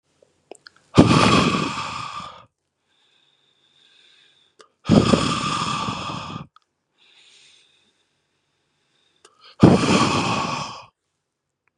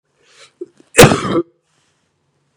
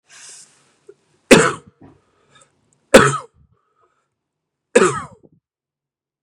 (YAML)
exhalation_length: 11.8 s
exhalation_amplitude: 32768
exhalation_signal_mean_std_ratio: 0.38
cough_length: 2.6 s
cough_amplitude: 32768
cough_signal_mean_std_ratio: 0.29
three_cough_length: 6.2 s
three_cough_amplitude: 32768
three_cough_signal_mean_std_ratio: 0.24
survey_phase: beta (2021-08-13 to 2022-03-07)
age: 18-44
wearing_mask: 'Yes'
symptom_runny_or_blocked_nose: true
smoker_status: Current smoker (11 or more cigarettes per day)
respiratory_condition_asthma: false
respiratory_condition_other: false
recruitment_source: Test and Trace
submission_delay: 2 days
covid_test_result: Positive
covid_test_method: RT-qPCR
covid_ct_value: 25.3
covid_ct_gene: N gene